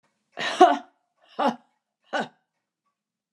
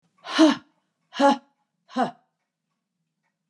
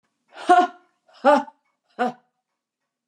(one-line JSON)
{"cough_length": "3.3 s", "cough_amplitude": 29759, "cough_signal_mean_std_ratio": 0.27, "exhalation_length": "3.5 s", "exhalation_amplitude": 19843, "exhalation_signal_mean_std_ratio": 0.3, "three_cough_length": "3.1 s", "three_cough_amplitude": 23910, "three_cough_signal_mean_std_ratio": 0.31, "survey_phase": "alpha (2021-03-01 to 2021-08-12)", "age": "65+", "gender": "Female", "wearing_mask": "No", "symptom_none": true, "smoker_status": "Never smoked", "respiratory_condition_asthma": false, "respiratory_condition_other": false, "recruitment_source": "REACT", "submission_delay": "3 days", "covid_test_result": "Negative", "covid_test_method": "RT-qPCR"}